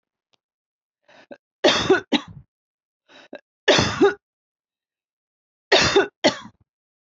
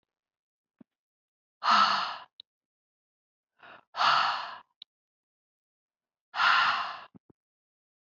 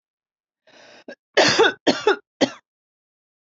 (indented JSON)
{
  "three_cough_length": "7.2 s",
  "three_cough_amplitude": 27898,
  "three_cough_signal_mean_std_ratio": 0.33,
  "exhalation_length": "8.1 s",
  "exhalation_amplitude": 9244,
  "exhalation_signal_mean_std_ratio": 0.35,
  "cough_length": "3.4 s",
  "cough_amplitude": 23522,
  "cough_signal_mean_std_ratio": 0.34,
  "survey_phase": "beta (2021-08-13 to 2022-03-07)",
  "age": "45-64",
  "gender": "Female",
  "wearing_mask": "No",
  "symptom_none": true,
  "symptom_onset": "12 days",
  "smoker_status": "Never smoked",
  "respiratory_condition_asthma": false,
  "respiratory_condition_other": false,
  "recruitment_source": "REACT",
  "submission_delay": "2 days",
  "covid_test_result": "Negative",
  "covid_test_method": "RT-qPCR",
  "influenza_a_test_result": "Negative",
  "influenza_b_test_result": "Negative"
}